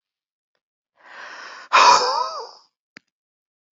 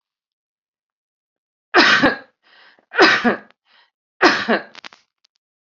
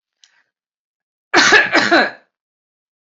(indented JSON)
{
  "exhalation_length": "3.8 s",
  "exhalation_amplitude": 28690,
  "exhalation_signal_mean_std_ratio": 0.32,
  "three_cough_length": "5.7 s",
  "three_cough_amplitude": 32767,
  "three_cough_signal_mean_std_ratio": 0.34,
  "cough_length": "3.2 s",
  "cough_amplitude": 29072,
  "cough_signal_mean_std_ratio": 0.38,
  "survey_phase": "beta (2021-08-13 to 2022-03-07)",
  "age": "45-64",
  "gender": "Female",
  "wearing_mask": "No",
  "symptom_none": true,
  "smoker_status": "Ex-smoker",
  "respiratory_condition_asthma": false,
  "respiratory_condition_other": false,
  "recruitment_source": "REACT",
  "submission_delay": "3 days",
  "covid_test_result": "Negative",
  "covid_test_method": "RT-qPCR",
  "influenza_a_test_result": "Negative",
  "influenza_b_test_result": "Negative"
}